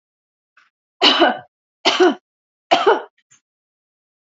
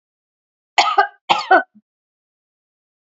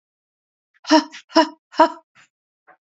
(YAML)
three_cough_length: 4.3 s
three_cough_amplitude: 30024
three_cough_signal_mean_std_ratio: 0.36
cough_length: 3.2 s
cough_amplitude: 28659
cough_signal_mean_std_ratio: 0.3
exhalation_length: 3.0 s
exhalation_amplitude: 27721
exhalation_signal_mean_std_ratio: 0.27
survey_phase: alpha (2021-03-01 to 2021-08-12)
age: 45-64
gender: Female
wearing_mask: 'No'
symptom_none: true
smoker_status: Never smoked
respiratory_condition_asthma: false
respiratory_condition_other: false
recruitment_source: REACT
submission_delay: 5 days
covid_test_result: Negative
covid_test_method: RT-qPCR